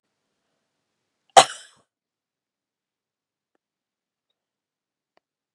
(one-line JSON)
{"cough_length": "5.5 s", "cough_amplitude": 32768, "cough_signal_mean_std_ratio": 0.09, "survey_phase": "beta (2021-08-13 to 2022-03-07)", "age": "45-64", "gender": "Female", "wearing_mask": "No", "symptom_fatigue": true, "symptom_onset": "2 days", "smoker_status": "Ex-smoker", "respiratory_condition_asthma": false, "respiratory_condition_other": false, "recruitment_source": "Test and Trace", "submission_delay": "1 day", "covid_test_result": "Negative", "covid_test_method": "RT-qPCR"}